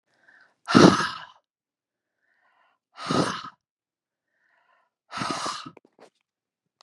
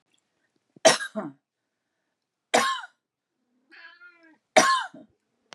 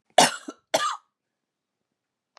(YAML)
exhalation_length: 6.8 s
exhalation_amplitude: 30460
exhalation_signal_mean_std_ratio: 0.25
three_cough_length: 5.5 s
three_cough_amplitude: 25558
three_cough_signal_mean_std_ratio: 0.27
cough_length: 2.4 s
cough_amplitude: 24545
cough_signal_mean_std_ratio: 0.26
survey_phase: beta (2021-08-13 to 2022-03-07)
age: 45-64
gender: Female
wearing_mask: 'No'
symptom_none: true
smoker_status: Never smoked
respiratory_condition_asthma: false
respiratory_condition_other: false
recruitment_source: REACT
submission_delay: 2 days
covid_test_result: Negative
covid_test_method: RT-qPCR
influenza_a_test_result: Negative
influenza_b_test_result: Negative